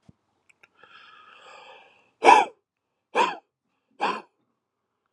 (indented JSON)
{
  "exhalation_length": "5.1 s",
  "exhalation_amplitude": 27515,
  "exhalation_signal_mean_std_ratio": 0.24,
  "survey_phase": "alpha (2021-03-01 to 2021-08-12)",
  "age": "18-44",
  "gender": "Male",
  "wearing_mask": "No",
  "symptom_cough_any": true,
  "symptom_new_continuous_cough": true,
  "symptom_onset": "2 days",
  "smoker_status": "Ex-smoker",
  "respiratory_condition_asthma": true,
  "respiratory_condition_other": false,
  "recruitment_source": "Test and Trace",
  "submission_delay": "2 days",
  "covid_test_result": "Positive",
  "covid_test_method": "RT-qPCR",
  "covid_ct_value": 19.7,
  "covid_ct_gene": "N gene",
  "covid_ct_mean": 20.3,
  "covid_viral_load": "230000 copies/ml",
  "covid_viral_load_category": "Low viral load (10K-1M copies/ml)"
}